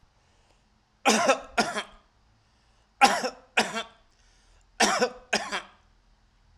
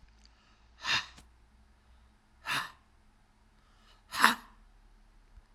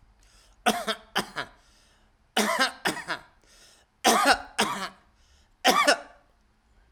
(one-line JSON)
{"three_cough_length": "6.6 s", "three_cough_amplitude": 20809, "three_cough_signal_mean_std_ratio": 0.36, "exhalation_length": "5.5 s", "exhalation_amplitude": 22912, "exhalation_signal_mean_std_ratio": 0.26, "cough_length": "6.9 s", "cough_amplitude": 21335, "cough_signal_mean_std_ratio": 0.4, "survey_phase": "alpha (2021-03-01 to 2021-08-12)", "age": "65+", "gender": "Male", "wearing_mask": "No", "symptom_none": true, "symptom_fatigue": true, "smoker_status": "Never smoked", "respiratory_condition_asthma": false, "respiratory_condition_other": false, "recruitment_source": "REACT", "submission_delay": "1 day", "covid_test_result": "Negative", "covid_test_method": "RT-qPCR"}